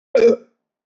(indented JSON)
{
  "cough_length": "0.9 s",
  "cough_amplitude": 21189,
  "cough_signal_mean_std_ratio": 0.43,
  "survey_phase": "beta (2021-08-13 to 2022-03-07)",
  "age": "45-64",
  "gender": "Male",
  "wearing_mask": "No",
  "symptom_none": true,
  "symptom_onset": "12 days",
  "smoker_status": "Never smoked",
  "respiratory_condition_asthma": false,
  "respiratory_condition_other": false,
  "recruitment_source": "REACT",
  "submission_delay": "3 days",
  "covid_test_result": "Negative",
  "covid_test_method": "RT-qPCR"
}